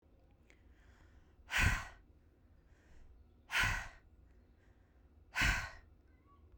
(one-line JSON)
{"exhalation_length": "6.6 s", "exhalation_amplitude": 3521, "exhalation_signal_mean_std_ratio": 0.36, "survey_phase": "beta (2021-08-13 to 2022-03-07)", "age": "18-44", "gender": "Female", "wearing_mask": "Yes", "symptom_fatigue": true, "smoker_status": "Ex-smoker", "respiratory_condition_asthma": false, "respiratory_condition_other": false, "recruitment_source": "Test and Trace", "submission_delay": "3 days", "covid_test_result": "Positive", "covid_test_method": "RT-qPCR", "covid_ct_value": 22.2, "covid_ct_gene": "ORF1ab gene"}